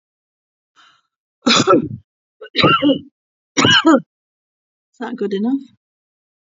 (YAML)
cough_length: 6.5 s
cough_amplitude: 32767
cough_signal_mean_std_ratio: 0.41
survey_phase: alpha (2021-03-01 to 2021-08-12)
age: 65+
gender: Female
wearing_mask: 'No'
symptom_headache: true
smoker_status: Never smoked
respiratory_condition_asthma: false
respiratory_condition_other: false
recruitment_source: REACT
submission_delay: 1 day
covid_test_result: Negative
covid_test_method: RT-qPCR